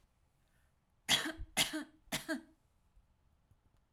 {"three_cough_length": "3.9 s", "three_cough_amplitude": 4763, "three_cough_signal_mean_std_ratio": 0.33, "survey_phase": "alpha (2021-03-01 to 2021-08-12)", "age": "45-64", "gender": "Female", "wearing_mask": "No", "symptom_none": true, "smoker_status": "Ex-smoker", "respiratory_condition_asthma": false, "respiratory_condition_other": false, "recruitment_source": "REACT", "submission_delay": "2 days", "covid_test_result": "Negative", "covid_test_method": "RT-qPCR"}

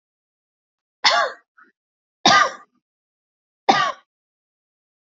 {"three_cough_length": "5.0 s", "three_cough_amplitude": 32742, "three_cough_signal_mean_std_ratio": 0.29, "survey_phase": "alpha (2021-03-01 to 2021-08-12)", "age": "18-44", "gender": "Female", "wearing_mask": "No", "symptom_fatigue": true, "smoker_status": "Never smoked", "respiratory_condition_asthma": true, "respiratory_condition_other": false, "recruitment_source": "Test and Trace", "submission_delay": "2 days", "covid_test_result": "Positive", "covid_test_method": "RT-qPCR", "covid_ct_value": 23.5, "covid_ct_gene": "ORF1ab gene", "covid_ct_mean": 23.8, "covid_viral_load": "16000 copies/ml", "covid_viral_load_category": "Low viral load (10K-1M copies/ml)"}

